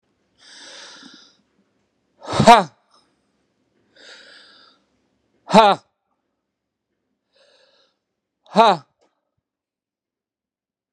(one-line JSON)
{"exhalation_length": "10.9 s", "exhalation_amplitude": 32768, "exhalation_signal_mean_std_ratio": 0.2, "survey_phase": "beta (2021-08-13 to 2022-03-07)", "age": "45-64", "gender": "Male", "wearing_mask": "No", "symptom_none": true, "symptom_onset": "8 days", "smoker_status": "Never smoked", "respiratory_condition_asthma": false, "respiratory_condition_other": false, "recruitment_source": "REACT", "submission_delay": "1 day", "covid_test_result": "Negative", "covid_test_method": "RT-qPCR"}